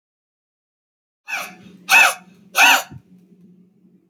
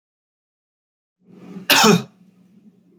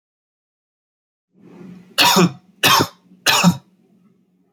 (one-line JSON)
{"exhalation_length": "4.1 s", "exhalation_amplitude": 28115, "exhalation_signal_mean_std_ratio": 0.31, "cough_length": "3.0 s", "cough_amplitude": 30558, "cough_signal_mean_std_ratio": 0.28, "three_cough_length": "4.5 s", "three_cough_amplitude": 30897, "three_cough_signal_mean_std_ratio": 0.37, "survey_phase": "beta (2021-08-13 to 2022-03-07)", "age": "18-44", "gender": "Male", "wearing_mask": "No", "symptom_none": true, "smoker_status": "Never smoked", "respiratory_condition_asthma": false, "respiratory_condition_other": false, "recruitment_source": "REACT", "submission_delay": "0 days", "covid_test_result": "Negative", "covid_test_method": "RT-qPCR"}